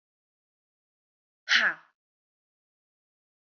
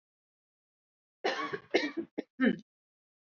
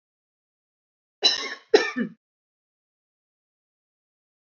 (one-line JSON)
{"exhalation_length": "3.6 s", "exhalation_amplitude": 14229, "exhalation_signal_mean_std_ratio": 0.2, "three_cough_length": "3.3 s", "three_cough_amplitude": 8032, "three_cough_signal_mean_std_ratio": 0.34, "cough_length": "4.4 s", "cough_amplitude": 21472, "cough_signal_mean_std_ratio": 0.22, "survey_phase": "alpha (2021-03-01 to 2021-08-12)", "age": "18-44", "gender": "Female", "wearing_mask": "No", "symptom_none": true, "smoker_status": "Never smoked", "respiratory_condition_asthma": false, "respiratory_condition_other": false, "recruitment_source": "Test and Trace", "submission_delay": "0 days", "covid_test_result": "Negative", "covid_test_method": "LFT"}